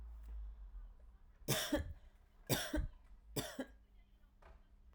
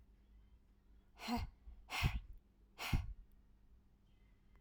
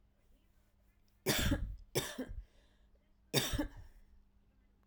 {"three_cough_length": "4.9 s", "three_cough_amplitude": 3038, "three_cough_signal_mean_std_ratio": 0.53, "exhalation_length": "4.6 s", "exhalation_amplitude": 2245, "exhalation_signal_mean_std_ratio": 0.4, "cough_length": "4.9 s", "cough_amplitude": 5301, "cough_signal_mean_std_ratio": 0.42, "survey_phase": "alpha (2021-03-01 to 2021-08-12)", "age": "18-44", "gender": "Female", "wearing_mask": "No", "symptom_cough_any": true, "symptom_shortness_of_breath": true, "symptom_abdominal_pain": true, "symptom_fatigue": true, "symptom_change_to_sense_of_smell_or_taste": true, "symptom_onset": "10 days", "smoker_status": "Ex-smoker", "respiratory_condition_asthma": false, "respiratory_condition_other": false, "recruitment_source": "Test and Trace", "submission_delay": "3 days", "covid_test_result": "Positive", "covid_test_method": "RT-qPCR", "covid_ct_value": 15.6, "covid_ct_gene": "ORF1ab gene", "covid_ct_mean": 16.5, "covid_viral_load": "4000000 copies/ml", "covid_viral_load_category": "High viral load (>1M copies/ml)"}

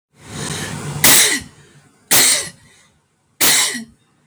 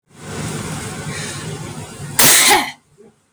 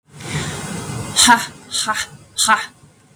{"three_cough_length": "4.3 s", "three_cough_amplitude": 32768, "three_cough_signal_mean_std_ratio": 0.5, "cough_length": "3.3 s", "cough_amplitude": 32768, "cough_signal_mean_std_ratio": 0.54, "exhalation_length": "3.2 s", "exhalation_amplitude": 32768, "exhalation_signal_mean_std_ratio": 0.52, "survey_phase": "beta (2021-08-13 to 2022-03-07)", "age": "18-44", "gender": "Female", "wearing_mask": "No", "symptom_runny_or_blocked_nose": true, "symptom_shortness_of_breath": true, "symptom_fatigue": true, "symptom_loss_of_taste": true, "symptom_onset": "6 days", "smoker_status": "Never smoked", "respiratory_condition_asthma": false, "respiratory_condition_other": false, "recruitment_source": "Test and Trace", "submission_delay": "3 days", "covid_test_result": "Positive", "covid_test_method": "RT-qPCR", "covid_ct_value": 24.3, "covid_ct_gene": "ORF1ab gene", "covid_ct_mean": 25.2, "covid_viral_load": "5500 copies/ml", "covid_viral_load_category": "Minimal viral load (< 10K copies/ml)"}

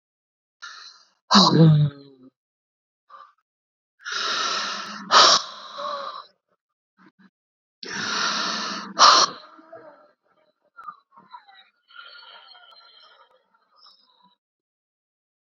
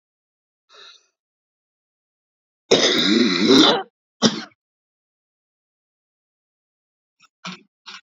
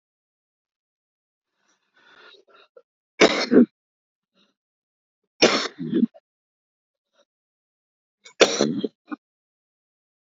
{"exhalation_length": "15.5 s", "exhalation_amplitude": 29264, "exhalation_signal_mean_std_ratio": 0.33, "cough_length": "8.0 s", "cough_amplitude": 31929, "cough_signal_mean_std_ratio": 0.31, "three_cough_length": "10.3 s", "three_cough_amplitude": 31558, "three_cough_signal_mean_std_ratio": 0.24, "survey_phase": "beta (2021-08-13 to 2022-03-07)", "age": "45-64", "gender": "Female", "wearing_mask": "No", "symptom_shortness_of_breath": true, "symptom_onset": "2 days", "smoker_status": "Current smoker (11 or more cigarettes per day)", "respiratory_condition_asthma": false, "respiratory_condition_other": true, "recruitment_source": "Test and Trace", "submission_delay": "1 day", "covid_test_result": "Negative", "covid_test_method": "RT-qPCR"}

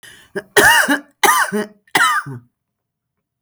{"three_cough_length": "3.4 s", "three_cough_amplitude": 32768, "three_cough_signal_mean_std_ratio": 0.48, "survey_phase": "beta (2021-08-13 to 2022-03-07)", "age": "18-44", "gender": "Female", "wearing_mask": "No", "symptom_none": true, "smoker_status": "Ex-smoker", "respiratory_condition_asthma": false, "respiratory_condition_other": false, "recruitment_source": "REACT", "submission_delay": "1 day", "covid_test_result": "Negative", "covid_test_method": "RT-qPCR"}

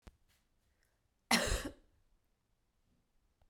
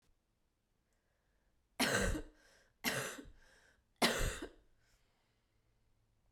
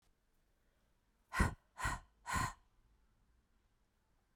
{"cough_length": "3.5 s", "cough_amplitude": 5737, "cough_signal_mean_std_ratio": 0.25, "three_cough_length": "6.3 s", "three_cough_amplitude": 4554, "three_cough_signal_mean_std_ratio": 0.35, "exhalation_length": "4.4 s", "exhalation_amplitude": 3675, "exhalation_signal_mean_std_ratio": 0.3, "survey_phase": "beta (2021-08-13 to 2022-03-07)", "age": "18-44", "gender": "Female", "wearing_mask": "No", "symptom_cough_any": true, "symptom_runny_or_blocked_nose": true, "symptom_sore_throat": true, "symptom_fatigue": true, "symptom_onset": "5 days", "smoker_status": "Never smoked", "respiratory_condition_asthma": false, "respiratory_condition_other": false, "recruitment_source": "Test and Trace", "submission_delay": "2 days", "covid_test_result": "Positive", "covid_test_method": "RT-qPCR", "covid_ct_value": 17.4, "covid_ct_gene": "ORF1ab gene", "covid_ct_mean": 17.8, "covid_viral_load": "1500000 copies/ml", "covid_viral_load_category": "High viral load (>1M copies/ml)"}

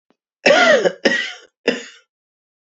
{"three_cough_length": "2.6 s", "three_cough_amplitude": 28090, "three_cough_signal_mean_std_ratio": 0.45, "survey_phase": "beta (2021-08-13 to 2022-03-07)", "age": "45-64", "gender": "Male", "wearing_mask": "No", "symptom_headache": true, "symptom_onset": "10 days", "smoker_status": "Never smoked", "respiratory_condition_asthma": true, "respiratory_condition_other": false, "recruitment_source": "REACT", "submission_delay": "0 days", "covid_test_result": "Negative", "covid_test_method": "RT-qPCR", "influenza_a_test_result": "Negative", "influenza_b_test_result": "Negative"}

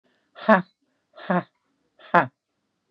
{"exhalation_length": "2.9 s", "exhalation_amplitude": 30629, "exhalation_signal_mean_std_ratio": 0.24, "survey_phase": "beta (2021-08-13 to 2022-03-07)", "age": "65+", "gender": "Female", "wearing_mask": "No", "symptom_cough_any": true, "symptom_shortness_of_breath": true, "symptom_sore_throat": true, "symptom_change_to_sense_of_smell_or_taste": true, "symptom_onset": "9 days", "smoker_status": "Never smoked", "respiratory_condition_asthma": false, "respiratory_condition_other": false, "recruitment_source": "Test and Trace", "submission_delay": "1 day", "covid_test_result": "Negative", "covid_test_method": "RT-qPCR"}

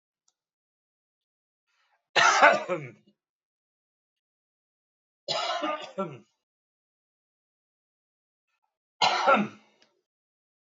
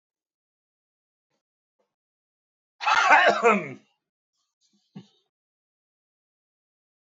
{"three_cough_length": "10.8 s", "three_cough_amplitude": 19267, "three_cough_signal_mean_std_ratio": 0.28, "cough_length": "7.2 s", "cough_amplitude": 20204, "cough_signal_mean_std_ratio": 0.25, "survey_phase": "beta (2021-08-13 to 2022-03-07)", "age": "65+", "gender": "Male", "wearing_mask": "No", "symptom_none": true, "smoker_status": "Never smoked", "respiratory_condition_asthma": false, "respiratory_condition_other": false, "recruitment_source": "REACT", "submission_delay": "1 day", "covid_test_result": "Negative", "covid_test_method": "RT-qPCR"}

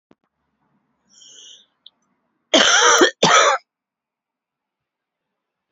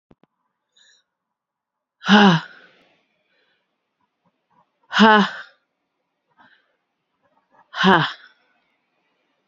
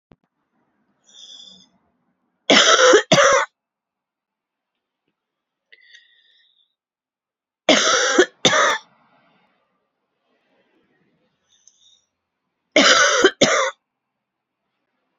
{"cough_length": "5.7 s", "cough_amplitude": 30558, "cough_signal_mean_std_ratio": 0.33, "exhalation_length": "9.5 s", "exhalation_amplitude": 29420, "exhalation_signal_mean_std_ratio": 0.26, "three_cough_length": "15.2 s", "three_cough_amplitude": 30835, "three_cough_signal_mean_std_ratio": 0.33, "survey_phase": "beta (2021-08-13 to 2022-03-07)", "age": "45-64", "gender": "Female", "wearing_mask": "No", "symptom_cough_any": true, "symptom_runny_or_blocked_nose": true, "symptom_shortness_of_breath": true, "symptom_sore_throat": true, "symptom_diarrhoea": true, "symptom_fatigue": true, "symptom_fever_high_temperature": true, "symptom_headache": true, "symptom_change_to_sense_of_smell_or_taste": true, "symptom_loss_of_taste": true, "symptom_other": true, "symptom_onset": "3 days", "smoker_status": "Never smoked", "respiratory_condition_asthma": true, "respiratory_condition_other": false, "recruitment_source": "Test and Trace", "submission_delay": "2 days", "covid_test_result": "Positive", "covid_test_method": "RT-qPCR", "covid_ct_value": 16.7, "covid_ct_gene": "ORF1ab gene", "covid_ct_mean": 18.1, "covid_viral_load": "1200000 copies/ml", "covid_viral_load_category": "High viral load (>1M copies/ml)"}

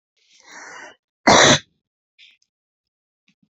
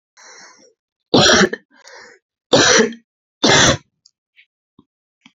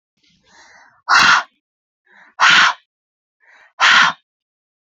{"cough_length": "3.5 s", "cough_amplitude": 31713, "cough_signal_mean_std_ratio": 0.26, "three_cough_length": "5.4 s", "three_cough_amplitude": 32768, "three_cough_signal_mean_std_ratio": 0.38, "exhalation_length": "4.9 s", "exhalation_amplitude": 31008, "exhalation_signal_mean_std_ratio": 0.38, "survey_phase": "beta (2021-08-13 to 2022-03-07)", "age": "45-64", "gender": "Female", "wearing_mask": "No", "symptom_cough_any": true, "symptom_runny_or_blocked_nose": true, "symptom_sore_throat": true, "symptom_fatigue": true, "smoker_status": "Never smoked", "respiratory_condition_asthma": false, "respiratory_condition_other": true, "recruitment_source": "Test and Trace", "submission_delay": "1 day", "covid_test_result": "Positive", "covid_test_method": "LFT"}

